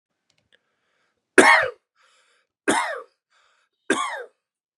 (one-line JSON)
{"three_cough_length": "4.8 s", "three_cough_amplitude": 32768, "three_cough_signal_mean_std_ratio": 0.28, "survey_phase": "beta (2021-08-13 to 2022-03-07)", "age": "18-44", "gender": "Male", "wearing_mask": "No", "symptom_none": true, "smoker_status": "Never smoked", "respiratory_condition_asthma": false, "respiratory_condition_other": false, "recruitment_source": "REACT", "submission_delay": "3 days", "covid_test_result": "Negative", "covid_test_method": "RT-qPCR", "influenza_a_test_result": "Negative", "influenza_b_test_result": "Negative"}